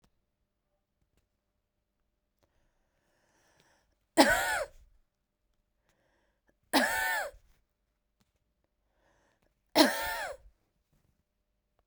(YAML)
three_cough_length: 11.9 s
three_cough_amplitude: 17895
three_cough_signal_mean_std_ratio: 0.25
survey_phase: beta (2021-08-13 to 2022-03-07)
age: 45-64
gender: Female
wearing_mask: 'No'
symptom_cough_any: true
symptom_sore_throat: true
symptom_fatigue: true
symptom_headache: true
symptom_onset: 3 days
smoker_status: Ex-smoker
respiratory_condition_asthma: false
respiratory_condition_other: false
recruitment_source: Test and Trace
submission_delay: 1 day
covid_test_result: Positive
covid_test_method: RT-qPCR
covid_ct_value: 17.9
covid_ct_gene: N gene
covid_ct_mean: 18.8
covid_viral_load: 660000 copies/ml
covid_viral_load_category: Low viral load (10K-1M copies/ml)